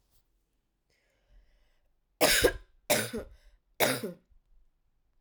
{"three_cough_length": "5.2 s", "three_cough_amplitude": 10420, "three_cough_signal_mean_std_ratio": 0.32, "survey_phase": "alpha (2021-03-01 to 2021-08-12)", "age": "18-44", "gender": "Female", "wearing_mask": "No", "symptom_cough_any": true, "symptom_fatigue": true, "symptom_onset": "2 days", "smoker_status": "Never smoked", "respiratory_condition_asthma": false, "respiratory_condition_other": false, "recruitment_source": "Test and Trace", "submission_delay": "1 day", "covid_test_result": "Positive", "covid_test_method": "RT-qPCR", "covid_ct_value": 21.7, "covid_ct_gene": "ORF1ab gene", "covid_ct_mean": 22.3, "covid_viral_load": "48000 copies/ml", "covid_viral_load_category": "Low viral load (10K-1M copies/ml)"}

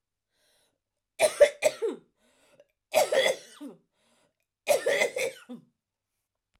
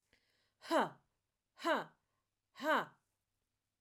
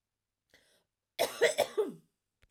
{"three_cough_length": "6.6 s", "three_cough_amplitude": 15531, "three_cough_signal_mean_std_ratio": 0.35, "exhalation_length": "3.8 s", "exhalation_amplitude": 2725, "exhalation_signal_mean_std_ratio": 0.32, "cough_length": "2.5 s", "cough_amplitude": 7845, "cough_signal_mean_std_ratio": 0.34, "survey_phase": "beta (2021-08-13 to 2022-03-07)", "age": "18-44", "gender": "Female", "wearing_mask": "No", "symptom_runny_or_blocked_nose": true, "symptom_fatigue": true, "symptom_headache": true, "symptom_onset": "10 days", "smoker_status": "Never smoked", "respiratory_condition_asthma": true, "respiratory_condition_other": false, "recruitment_source": "REACT", "submission_delay": "2 days", "covid_test_result": "Negative", "covid_test_method": "RT-qPCR"}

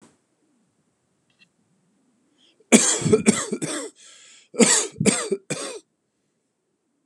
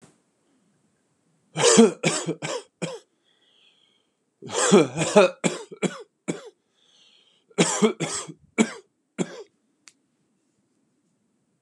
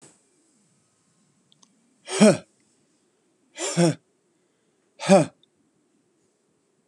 {"cough_length": "7.1 s", "cough_amplitude": 32768, "cough_signal_mean_std_ratio": 0.34, "three_cough_length": "11.6 s", "three_cough_amplitude": 29300, "three_cough_signal_mean_std_ratio": 0.33, "exhalation_length": "6.9 s", "exhalation_amplitude": 27523, "exhalation_signal_mean_std_ratio": 0.23, "survey_phase": "beta (2021-08-13 to 2022-03-07)", "age": "45-64", "gender": "Male", "wearing_mask": "No", "symptom_none": true, "smoker_status": "Ex-smoker", "respiratory_condition_asthma": false, "respiratory_condition_other": false, "recruitment_source": "REACT", "submission_delay": "1 day", "covid_test_result": "Negative", "covid_test_method": "RT-qPCR", "influenza_a_test_result": "Negative", "influenza_b_test_result": "Negative"}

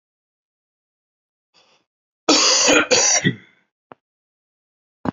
{"cough_length": "5.1 s", "cough_amplitude": 31595, "cough_signal_mean_std_ratio": 0.37, "survey_phase": "beta (2021-08-13 to 2022-03-07)", "age": "18-44", "gender": "Male", "wearing_mask": "No", "symptom_sore_throat": true, "symptom_headache": true, "symptom_onset": "4 days", "smoker_status": "Current smoker (e-cigarettes or vapes only)", "respiratory_condition_asthma": false, "respiratory_condition_other": false, "recruitment_source": "Test and Trace", "submission_delay": "2 days", "covid_test_result": "Positive", "covid_test_method": "RT-qPCR", "covid_ct_value": 28.3, "covid_ct_gene": "ORF1ab gene", "covid_ct_mean": 28.6, "covid_viral_load": "430 copies/ml", "covid_viral_load_category": "Minimal viral load (< 10K copies/ml)"}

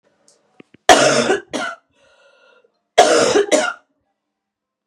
{"cough_length": "4.9 s", "cough_amplitude": 32768, "cough_signal_mean_std_ratio": 0.41, "survey_phase": "beta (2021-08-13 to 2022-03-07)", "age": "18-44", "gender": "Female", "wearing_mask": "No", "symptom_new_continuous_cough": true, "symptom_runny_or_blocked_nose": true, "symptom_sore_throat": true, "symptom_fatigue": true, "symptom_headache": true, "smoker_status": "Never smoked", "respiratory_condition_asthma": false, "respiratory_condition_other": false, "recruitment_source": "Test and Trace", "submission_delay": "1 day", "covid_test_result": "Positive", "covid_test_method": "LFT"}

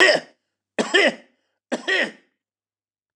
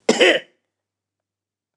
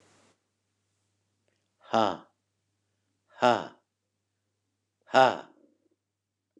{"three_cough_length": "3.2 s", "three_cough_amplitude": 28064, "three_cough_signal_mean_std_ratio": 0.38, "cough_length": "1.8 s", "cough_amplitude": 29195, "cough_signal_mean_std_ratio": 0.31, "exhalation_length": "6.6 s", "exhalation_amplitude": 15494, "exhalation_signal_mean_std_ratio": 0.21, "survey_phase": "beta (2021-08-13 to 2022-03-07)", "age": "65+", "gender": "Male", "wearing_mask": "No", "symptom_none": true, "smoker_status": "Ex-smoker", "respiratory_condition_asthma": false, "respiratory_condition_other": false, "recruitment_source": "REACT", "submission_delay": "3 days", "covid_test_result": "Negative", "covid_test_method": "RT-qPCR"}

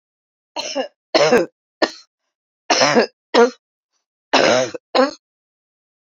{"cough_length": "6.1 s", "cough_amplitude": 32725, "cough_signal_mean_std_ratio": 0.4, "survey_phase": "beta (2021-08-13 to 2022-03-07)", "age": "45-64", "gender": "Female", "wearing_mask": "No", "symptom_shortness_of_breath": true, "symptom_fatigue": true, "symptom_other": true, "symptom_onset": "13 days", "smoker_status": "Ex-smoker", "respiratory_condition_asthma": false, "respiratory_condition_other": false, "recruitment_source": "REACT", "submission_delay": "2 days", "covid_test_result": "Negative", "covid_test_method": "RT-qPCR", "influenza_a_test_result": "Unknown/Void", "influenza_b_test_result": "Unknown/Void"}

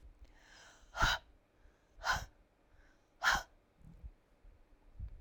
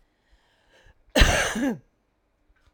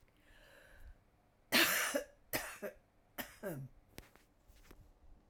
{"exhalation_length": "5.2 s", "exhalation_amplitude": 4442, "exhalation_signal_mean_std_ratio": 0.34, "cough_length": "2.7 s", "cough_amplitude": 25915, "cough_signal_mean_std_ratio": 0.34, "three_cough_length": "5.3 s", "three_cough_amplitude": 5294, "three_cough_signal_mean_std_ratio": 0.36, "survey_phase": "alpha (2021-03-01 to 2021-08-12)", "age": "45-64", "gender": "Female", "wearing_mask": "No", "symptom_none": true, "smoker_status": "Ex-smoker", "respiratory_condition_asthma": true, "respiratory_condition_other": false, "recruitment_source": "REACT", "submission_delay": "1 day", "covid_test_result": "Negative", "covid_test_method": "RT-qPCR"}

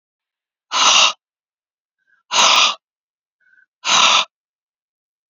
{"exhalation_length": "5.3 s", "exhalation_amplitude": 32768, "exhalation_signal_mean_std_ratio": 0.39, "survey_phase": "beta (2021-08-13 to 2022-03-07)", "age": "18-44", "gender": "Female", "wearing_mask": "No", "symptom_none": true, "smoker_status": "Never smoked", "respiratory_condition_asthma": false, "respiratory_condition_other": false, "recruitment_source": "REACT", "submission_delay": "1 day", "covid_test_result": "Negative", "covid_test_method": "RT-qPCR", "influenza_a_test_result": "Negative", "influenza_b_test_result": "Negative"}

